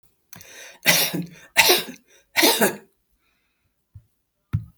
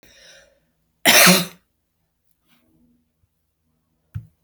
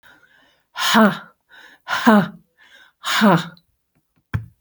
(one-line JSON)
{"three_cough_length": "4.8 s", "three_cough_amplitude": 32767, "three_cough_signal_mean_std_ratio": 0.38, "cough_length": "4.4 s", "cough_amplitude": 32768, "cough_signal_mean_std_ratio": 0.24, "exhalation_length": "4.6 s", "exhalation_amplitude": 28964, "exhalation_signal_mean_std_ratio": 0.41, "survey_phase": "beta (2021-08-13 to 2022-03-07)", "age": "65+", "gender": "Female", "wearing_mask": "No", "symptom_none": true, "smoker_status": "Ex-smoker", "respiratory_condition_asthma": false, "respiratory_condition_other": false, "recruitment_source": "REACT", "submission_delay": "1 day", "covid_test_result": "Negative", "covid_test_method": "RT-qPCR"}